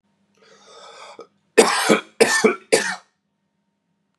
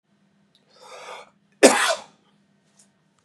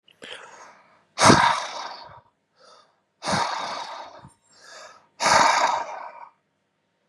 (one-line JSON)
{"three_cough_length": "4.2 s", "three_cough_amplitude": 32767, "three_cough_signal_mean_std_ratio": 0.36, "cough_length": "3.2 s", "cough_amplitude": 32767, "cough_signal_mean_std_ratio": 0.24, "exhalation_length": "7.1 s", "exhalation_amplitude": 28066, "exhalation_signal_mean_std_ratio": 0.4, "survey_phase": "beta (2021-08-13 to 2022-03-07)", "age": "18-44", "gender": "Male", "wearing_mask": "No", "symptom_none": true, "smoker_status": "Current smoker (e-cigarettes or vapes only)", "respiratory_condition_asthma": false, "respiratory_condition_other": false, "recruitment_source": "REACT", "submission_delay": "7 days", "covid_test_result": "Negative", "covid_test_method": "RT-qPCR", "influenza_a_test_result": "Negative", "influenza_b_test_result": "Negative"}